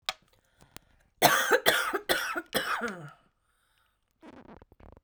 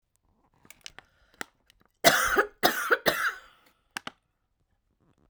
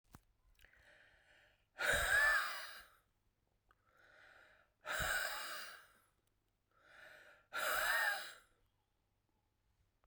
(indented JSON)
{
  "cough_length": "5.0 s",
  "cough_amplitude": 19925,
  "cough_signal_mean_std_ratio": 0.4,
  "three_cough_length": "5.3 s",
  "three_cough_amplitude": 23677,
  "three_cough_signal_mean_std_ratio": 0.32,
  "exhalation_length": "10.1 s",
  "exhalation_amplitude": 2496,
  "exhalation_signal_mean_std_ratio": 0.41,
  "survey_phase": "beta (2021-08-13 to 2022-03-07)",
  "age": "45-64",
  "gender": "Female",
  "wearing_mask": "No",
  "symptom_shortness_of_breath": true,
  "symptom_fatigue": true,
  "symptom_fever_high_temperature": true,
  "symptom_headache": true,
  "symptom_change_to_sense_of_smell_or_taste": true,
  "symptom_loss_of_taste": true,
  "smoker_status": "Ex-smoker",
  "respiratory_condition_asthma": false,
  "respiratory_condition_other": true,
  "recruitment_source": "Test and Trace",
  "submission_delay": "3 days",
  "covid_test_result": "Positive",
  "covid_test_method": "LFT"
}